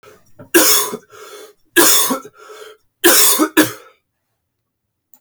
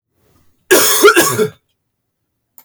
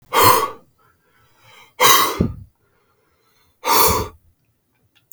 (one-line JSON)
{"three_cough_length": "5.2 s", "three_cough_amplitude": 32768, "three_cough_signal_mean_std_ratio": 0.44, "cough_length": "2.6 s", "cough_amplitude": 32768, "cough_signal_mean_std_ratio": 0.44, "exhalation_length": "5.1 s", "exhalation_amplitude": 32768, "exhalation_signal_mean_std_ratio": 0.4, "survey_phase": "beta (2021-08-13 to 2022-03-07)", "age": "18-44", "gender": "Male", "wearing_mask": "No", "symptom_runny_or_blocked_nose": true, "symptom_onset": "10 days", "smoker_status": "Never smoked", "respiratory_condition_asthma": true, "respiratory_condition_other": false, "recruitment_source": "REACT", "submission_delay": "1 day", "covid_test_result": "Negative", "covid_test_method": "RT-qPCR", "influenza_a_test_result": "Negative", "influenza_b_test_result": "Negative"}